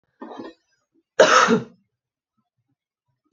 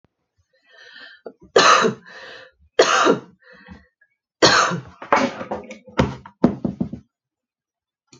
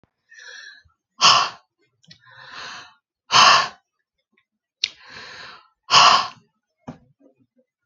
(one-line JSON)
{"cough_length": "3.3 s", "cough_amplitude": 28841, "cough_signal_mean_std_ratio": 0.29, "three_cough_length": "8.2 s", "three_cough_amplitude": 32768, "three_cough_signal_mean_std_ratio": 0.38, "exhalation_length": "7.9 s", "exhalation_amplitude": 32768, "exhalation_signal_mean_std_ratio": 0.3, "survey_phase": "alpha (2021-03-01 to 2021-08-12)", "age": "18-44", "gender": "Female", "wearing_mask": "No", "symptom_none": true, "smoker_status": "Ex-smoker", "respiratory_condition_asthma": false, "respiratory_condition_other": false, "recruitment_source": "REACT", "submission_delay": "1 day", "covid_test_result": "Negative", "covid_test_method": "RT-qPCR"}